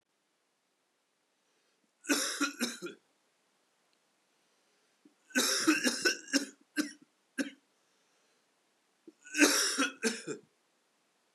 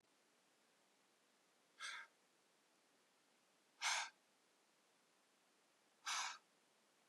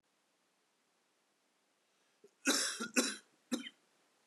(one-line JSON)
{"three_cough_length": "11.3 s", "three_cough_amplitude": 10498, "three_cough_signal_mean_std_ratio": 0.36, "exhalation_length": "7.1 s", "exhalation_amplitude": 1276, "exhalation_signal_mean_std_ratio": 0.3, "cough_length": "4.3 s", "cough_amplitude": 4759, "cough_signal_mean_std_ratio": 0.31, "survey_phase": "beta (2021-08-13 to 2022-03-07)", "age": "45-64", "gender": "Male", "wearing_mask": "No", "symptom_cough_any": true, "symptom_new_continuous_cough": true, "symptom_runny_or_blocked_nose": true, "symptom_shortness_of_breath": true, "symptom_sore_throat": true, "symptom_abdominal_pain": true, "symptom_diarrhoea": true, "symptom_fatigue": true, "symptom_headache": true, "symptom_onset": "4 days", "smoker_status": "Never smoked", "respiratory_condition_asthma": false, "respiratory_condition_other": false, "recruitment_source": "Test and Trace", "submission_delay": "2 days", "covid_test_result": "Positive", "covid_test_method": "RT-qPCR", "covid_ct_value": 17.1, "covid_ct_gene": "N gene"}